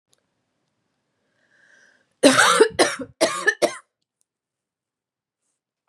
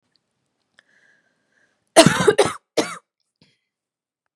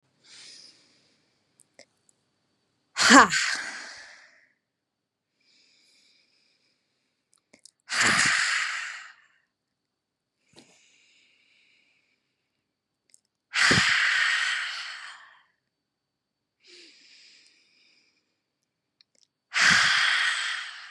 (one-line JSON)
{"three_cough_length": "5.9 s", "three_cough_amplitude": 31625, "three_cough_signal_mean_std_ratio": 0.3, "cough_length": "4.4 s", "cough_amplitude": 32768, "cough_signal_mean_std_ratio": 0.25, "exhalation_length": "20.9 s", "exhalation_amplitude": 32269, "exhalation_signal_mean_std_ratio": 0.33, "survey_phase": "beta (2021-08-13 to 2022-03-07)", "age": "18-44", "gender": "Female", "wearing_mask": "No", "symptom_none": true, "symptom_onset": "6 days", "smoker_status": "Never smoked", "respiratory_condition_asthma": true, "respiratory_condition_other": false, "recruitment_source": "REACT", "submission_delay": "4 days", "covid_test_result": "Positive", "covid_test_method": "RT-qPCR", "covid_ct_value": 25.0, "covid_ct_gene": "E gene", "influenza_a_test_result": "Negative", "influenza_b_test_result": "Negative"}